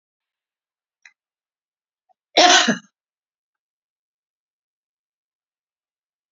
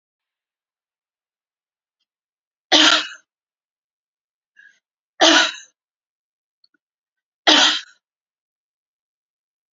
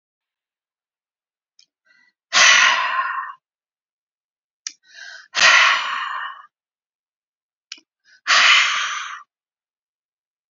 {"cough_length": "6.3 s", "cough_amplitude": 30580, "cough_signal_mean_std_ratio": 0.19, "three_cough_length": "9.7 s", "three_cough_amplitude": 32529, "three_cough_signal_mean_std_ratio": 0.24, "exhalation_length": "10.5 s", "exhalation_amplitude": 32767, "exhalation_signal_mean_std_ratio": 0.37, "survey_phase": "beta (2021-08-13 to 2022-03-07)", "age": "45-64", "gender": "Female", "wearing_mask": "No", "symptom_none": true, "smoker_status": "Ex-smoker", "respiratory_condition_asthma": false, "respiratory_condition_other": false, "recruitment_source": "REACT", "submission_delay": "3 days", "covid_test_result": "Negative", "covid_test_method": "RT-qPCR", "influenza_a_test_result": "Negative", "influenza_b_test_result": "Negative"}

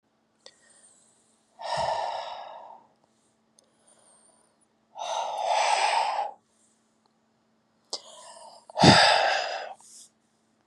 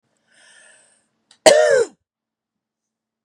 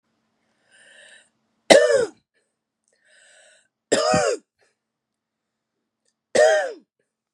{"exhalation_length": "10.7 s", "exhalation_amplitude": 26853, "exhalation_signal_mean_std_ratio": 0.38, "cough_length": "3.2 s", "cough_amplitude": 32768, "cough_signal_mean_std_ratio": 0.28, "three_cough_length": "7.3 s", "three_cough_amplitude": 32768, "three_cough_signal_mean_std_ratio": 0.3, "survey_phase": "beta (2021-08-13 to 2022-03-07)", "age": "45-64", "gender": "Female", "wearing_mask": "No", "symptom_cough_any": true, "symptom_runny_or_blocked_nose": true, "symptom_sore_throat": true, "symptom_onset": "3 days", "smoker_status": "Ex-smoker", "respiratory_condition_asthma": false, "respiratory_condition_other": false, "recruitment_source": "Test and Trace", "submission_delay": "2 days", "covid_test_result": "Positive", "covid_test_method": "RT-qPCR", "covid_ct_value": 13.4, "covid_ct_gene": "ORF1ab gene"}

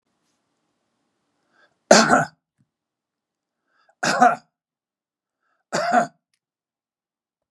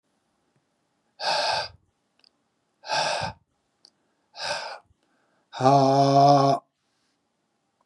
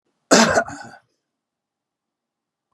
{"three_cough_length": "7.5 s", "three_cough_amplitude": 32768, "three_cough_signal_mean_std_ratio": 0.26, "exhalation_length": "7.9 s", "exhalation_amplitude": 19333, "exhalation_signal_mean_std_ratio": 0.4, "cough_length": "2.7 s", "cough_amplitude": 32656, "cough_signal_mean_std_ratio": 0.28, "survey_phase": "beta (2021-08-13 to 2022-03-07)", "age": "65+", "gender": "Male", "wearing_mask": "No", "symptom_none": true, "smoker_status": "Ex-smoker", "respiratory_condition_asthma": false, "respiratory_condition_other": false, "recruitment_source": "REACT", "submission_delay": "1 day", "covid_test_result": "Negative", "covid_test_method": "RT-qPCR", "influenza_a_test_result": "Unknown/Void", "influenza_b_test_result": "Unknown/Void"}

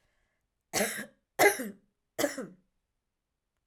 {"three_cough_length": "3.7 s", "three_cough_amplitude": 11584, "three_cough_signal_mean_std_ratio": 0.3, "survey_phase": "alpha (2021-03-01 to 2021-08-12)", "age": "18-44", "gender": "Female", "wearing_mask": "No", "symptom_none": true, "smoker_status": "Ex-smoker", "respiratory_condition_asthma": true, "respiratory_condition_other": false, "recruitment_source": "REACT", "submission_delay": "1 day", "covid_test_result": "Negative", "covid_test_method": "RT-qPCR"}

